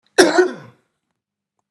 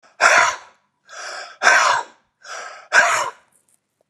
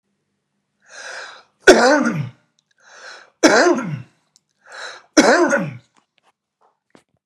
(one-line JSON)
{"cough_length": "1.7 s", "cough_amplitude": 32768, "cough_signal_mean_std_ratio": 0.33, "exhalation_length": "4.1 s", "exhalation_amplitude": 32552, "exhalation_signal_mean_std_ratio": 0.46, "three_cough_length": "7.3 s", "three_cough_amplitude": 32768, "three_cough_signal_mean_std_ratio": 0.37, "survey_phase": "beta (2021-08-13 to 2022-03-07)", "age": "45-64", "gender": "Male", "wearing_mask": "No", "symptom_none": true, "smoker_status": "Never smoked", "respiratory_condition_asthma": false, "respiratory_condition_other": false, "recruitment_source": "REACT", "submission_delay": "0 days", "covid_test_result": "Negative", "covid_test_method": "RT-qPCR"}